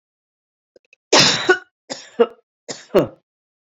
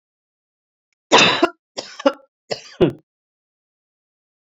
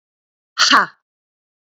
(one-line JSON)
{"cough_length": "3.7 s", "cough_amplitude": 30936, "cough_signal_mean_std_ratio": 0.32, "three_cough_length": "4.5 s", "three_cough_amplitude": 32768, "three_cough_signal_mean_std_ratio": 0.27, "exhalation_length": "1.8 s", "exhalation_amplitude": 31130, "exhalation_signal_mean_std_ratio": 0.3, "survey_phase": "beta (2021-08-13 to 2022-03-07)", "age": "45-64", "gender": "Female", "wearing_mask": "No", "symptom_none": true, "smoker_status": "Never smoked", "respiratory_condition_asthma": false, "respiratory_condition_other": false, "recruitment_source": "REACT", "submission_delay": "2 days", "covid_test_result": "Negative", "covid_test_method": "RT-qPCR"}